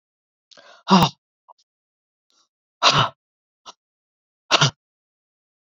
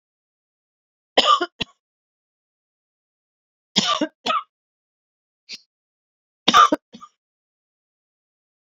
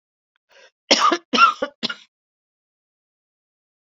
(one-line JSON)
{"exhalation_length": "5.6 s", "exhalation_amplitude": 29782, "exhalation_signal_mean_std_ratio": 0.26, "three_cough_length": "8.6 s", "three_cough_amplitude": 32768, "three_cough_signal_mean_std_ratio": 0.24, "cough_length": "3.8 s", "cough_amplitude": 29446, "cough_signal_mean_std_ratio": 0.29, "survey_phase": "beta (2021-08-13 to 2022-03-07)", "age": "45-64", "gender": "Female", "wearing_mask": "No", "symptom_cough_any": true, "symptom_runny_or_blocked_nose": true, "symptom_abdominal_pain": true, "symptom_fatigue": true, "symptom_fever_high_temperature": true, "symptom_headache": true, "symptom_onset": "2 days", "smoker_status": "Ex-smoker", "respiratory_condition_asthma": false, "respiratory_condition_other": false, "recruitment_source": "Test and Trace", "submission_delay": "2 days", "covid_test_result": "Positive", "covid_test_method": "RT-qPCR"}